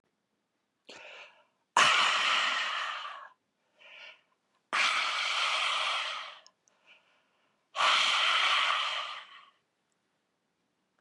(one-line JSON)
{"exhalation_length": "11.0 s", "exhalation_amplitude": 9652, "exhalation_signal_mean_std_ratio": 0.53, "survey_phase": "beta (2021-08-13 to 2022-03-07)", "age": "45-64", "gender": "Male", "wearing_mask": "No", "symptom_none": true, "smoker_status": "Never smoked", "respiratory_condition_asthma": false, "respiratory_condition_other": false, "recruitment_source": "REACT", "submission_delay": "2 days", "covid_test_result": "Negative", "covid_test_method": "RT-qPCR", "influenza_a_test_result": "Unknown/Void", "influenza_b_test_result": "Unknown/Void"}